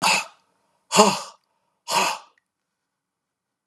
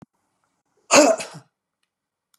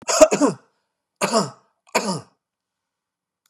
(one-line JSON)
{"exhalation_length": "3.7 s", "exhalation_amplitude": 32703, "exhalation_signal_mean_std_ratio": 0.34, "cough_length": "2.4 s", "cough_amplitude": 31836, "cough_signal_mean_std_ratio": 0.27, "three_cough_length": "3.5 s", "three_cough_amplitude": 32767, "three_cough_signal_mean_std_ratio": 0.34, "survey_phase": "beta (2021-08-13 to 2022-03-07)", "age": "65+", "gender": "Male", "wearing_mask": "No", "symptom_runny_or_blocked_nose": true, "smoker_status": "Ex-smoker", "respiratory_condition_asthma": false, "respiratory_condition_other": false, "recruitment_source": "REACT", "submission_delay": "2 days", "covid_test_result": "Negative", "covid_test_method": "RT-qPCR", "influenza_a_test_result": "Negative", "influenza_b_test_result": "Negative"}